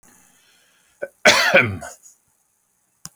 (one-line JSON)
{"cough_length": "3.2 s", "cough_amplitude": 29944, "cough_signal_mean_std_ratio": 0.31, "survey_phase": "beta (2021-08-13 to 2022-03-07)", "age": "45-64", "gender": "Male", "wearing_mask": "No", "symptom_none": true, "smoker_status": "Never smoked", "respiratory_condition_asthma": false, "respiratory_condition_other": false, "recruitment_source": "REACT", "submission_delay": "2 days", "covid_test_result": "Negative", "covid_test_method": "RT-qPCR"}